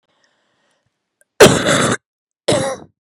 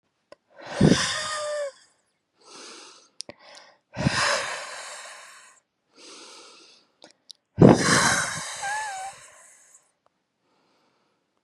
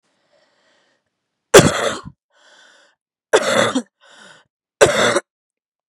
{"cough_length": "3.1 s", "cough_amplitude": 32768, "cough_signal_mean_std_ratio": 0.37, "exhalation_length": "11.4 s", "exhalation_amplitude": 31754, "exhalation_signal_mean_std_ratio": 0.35, "three_cough_length": "5.9 s", "three_cough_amplitude": 32768, "three_cough_signal_mean_std_ratio": 0.32, "survey_phase": "beta (2021-08-13 to 2022-03-07)", "age": "18-44", "gender": "Female", "wearing_mask": "No", "symptom_cough_any": true, "symptom_runny_or_blocked_nose": true, "symptom_shortness_of_breath": true, "symptom_fatigue": true, "symptom_headache": true, "symptom_other": true, "smoker_status": "Never smoked", "respiratory_condition_asthma": false, "respiratory_condition_other": false, "recruitment_source": "Test and Trace", "submission_delay": "2 days", "covid_test_result": "Positive", "covid_test_method": "LFT"}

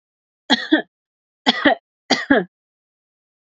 {"three_cough_length": "3.5 s", "three_cough_amplitude": 29929, "three_cough_signal_mean_std_ratio": 0.33, "survey_phase": "beta (2021-08-13 to 2022-03-07)", "age": "18-44", "gender": "Female", "wearing_mask": "No", "symptom_none": true, "smoker_status": "Never smoked", "respiratory_condition_asthma": false, "respiratory_condition_other": false, "recruitment_source": "REACT", "submission_delay": "3 days", "covid_test_result": "Negative", "covid_test_method": "RT-qPCR", "influenza_a_test_result": "Negative", "influenza_b_test_result": "Negative"}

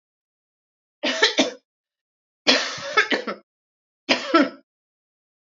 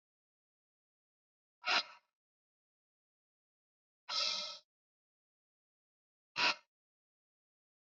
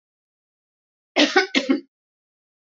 {"three_cough_length": "5.5 s", "three_cough_amplitude": 26526, "three_cough_signal_mean_std_ratio": 0.36, "exhalation_length": "7.9 s", "exhalation_amplitude": 3847, "exhalation_signal_mean_std_ratio": 0.23, "cough_length": "2.7 s", "cough_amplitude": 23418, "cough_signal_mean_std_ratio": 0.31, "survey_phase": "alpha (2021-03-01 to 2021-08-12)", "age": "45-64", "gender": "Female", "wearing_mask": "No", "symptom_none": true, "smoker_status": "Never smoked", "respiratory_condition_asthma": false, "respiratory_condition_other": false, "recruitment_source": "REACT", "submission_delay": "2 days", "covid_test_result": "Negative", "covid_test_method": "RT-qPCR"}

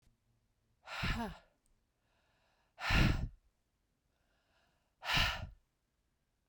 {"exhalation_length": "6.5 s", "exhalation_amplitude": 4888, "exhalation_signal_mean_std_ratio": 0.34, "survey_phase": "beta (2021-08-13 to 2022-03-07)", "age": "45-64", "gender": "Female", "wearing_mask": "No", "symptom_none": true, "smoker_status": "Never smoked", "respiratory_condition_asthma": false, "respiratory_condition_other": false, "recruitment_source": "REACT", "submission_delay": "1 day", "covid_test_result": "Negative", "covid_test_method": "RT-qPCR"}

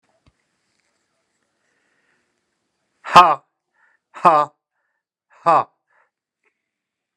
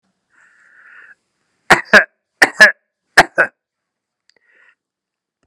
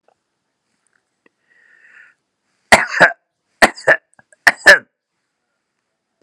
{"exhalation_length": "7.2 s", "exhalation_amplitude": 32768, "exhalation_signal_mean_std_ratio": 0.21, "three_cough_length": "5.5 s", "three_cough_amplitude": 32768, "three_cough_signal_mean_std_ratio": 0.24, "cough_length": "6.2 s", "cough_amplitude": 32768, "cough_signal_mean_std_ratio": 0.23, "survey_phase": "alpha (2021-03-01 to 2021-08-12)", "age": "65+", "gender": "Male", "wearing_mask": "No", "symptom_headache": true, "smoker_status": "Ex-smoker", "respiratory_condition_asthma": false, "respiratory_condition_other": false, "recruitment_source": "REACT", "submission_delay": "2 days", "covid_test_result": "Negative", "covid_test_method": "RT-qPCR"}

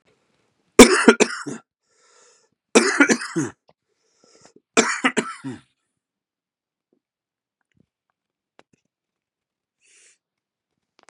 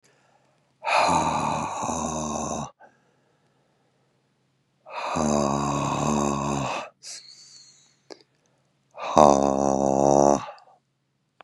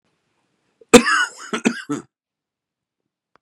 {"three_cough_length": "11.1 s", "three_cough_amplitude": 32768, "three_cough_signal_mean_std_ratio": 0.23, "exhalation_length": "11.4 s", "exhalation_amplitude": 31963, "exhalation_signal_mean_std_ratio": 0.46, "cough_length": "3.4 s", "cough_amplitude": 32768, "cough_signal_mean_std_ratio": 0.26, "survey_phase": "beta (2021-08-13 to 2022-03-07)", "age": "45-64", "gender": "Male", "wearing_mask": "No", "symptom_cough_any": true, "symptom_runny_or_blocked_nose": true, "symptom_sore_throat": true, "symptom_fever_high_temperature": true, "symptom_change_to_sense_of_smell_or_taste": true, "symptom_onset": "4 days", "smoker_status": "Never smoked", "respiratory_condition_asthma": false, "respiratory_condition_other": false, "recruitment_source": "Test and Trace", "submission_delay": "1 day", "covid_test_result": "Positive", "covid_test_method": "RT-qPCR", "covid_ct_value": 25.7, "covid_ct_gene": "N gene"}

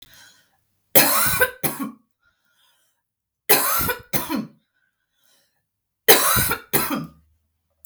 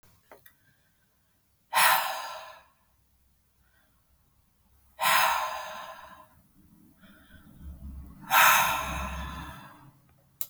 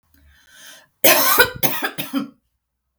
{"three_cough_length": "7.9 s", "three_cough_amplitude": 32768, "three_cough_signal_mean_std_ratio": 0.4, "exhalation_length": "10.5 s", "exhalation_amplitude": 15516, "exhalation_signal_mean_std_ratio": 0.37, "cough_length": "3.0 s", "cough_amplitude": 32768, "cough_signal_mean_std_ratio": 0.42, "survey_phase": "beta (2021-08-13 to 2022-03-07)", "age": "18-44", "gender": "Female", "wearing_mask": "No", "symptom_runny_or_blocked_nose": true, "symptom_sore_throat": true, "smoker_status": "Never smoked", "respiratory_condition_asthma": false, "respiratory_condition_other": false, "recruitment_source": "REACT", "submission_delay": "9 days", "covid_test_result": "Negative", "covid_test_method": "RT-qPCR", "influenza_a_test_result": "Negative", "influenza_b_test_result": "Negative"}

